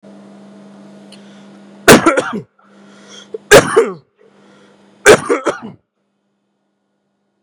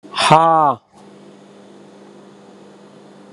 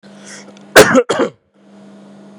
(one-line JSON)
{"three_cough_length": "7.4 s", "three_cough_amplitude": 32768, "three_cough_signal_mean_std_ratio": 0.31, "exhalation_length": "3.3 s", "exhalation_amplitude": 32768, "exhalation_signal_mean_std_ratio": 0.36, "cough_length": "2.4 s", "cough_amplitude": 32768, "cough_signal_mean_std_ratio": 0.36, "survey_phase": "beta (2021-08-13 to 2022-03-07)", "age": "18-44", "gender": "Male", "wearing_mask": "Yes", "symptom_cough_any": true, "smoker_status": "Never smoked", "respiratory_condition_asthma": false, "respiratory_condition_other": false, "recruitment_source": "REACT", "submission_delay": "0 days", "covid_test_result": "Negative", "covid_test_method": "RT-qPCR", "influenza_a_test_result": "Negative", "influenza_b_test_result": "Negative"}